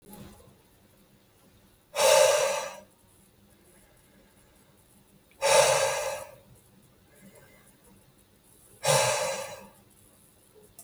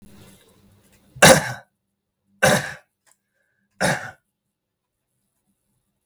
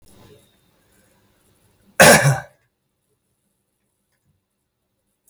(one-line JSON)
{"exhalation_length": "10.8 s", "exhalation_amplitude": 17309, "exhalation_signal_mean_std_ratio": 0.37, "three_cough_length": "6.1 s", "three_cough_amplitude": 32768, "three_cough_signal_mean_std_ratio": 0.24, "cough_length": "5.3 s", "cough_amplitude": 32768, "cough_signal_mean_std_ratio": 0.21, "survey_phase": "beta (2021-08-13 to 2022-03-07)", "age": "18-44", "gender": "Male", "wearing_mask": "No", "symptom_none": true, "smoker_status": "Never smoked", "respiratory_condition_asthma": false, "respiratory_condition_other": false, "recruitment_source": "REACT", "submission_delay": "6 days", "covid_test_result": "Negative", "covid_test_method": "RT-qPCR", "influenza_a_test_result": "Negative", "influenza_b_test_result": "Negative"}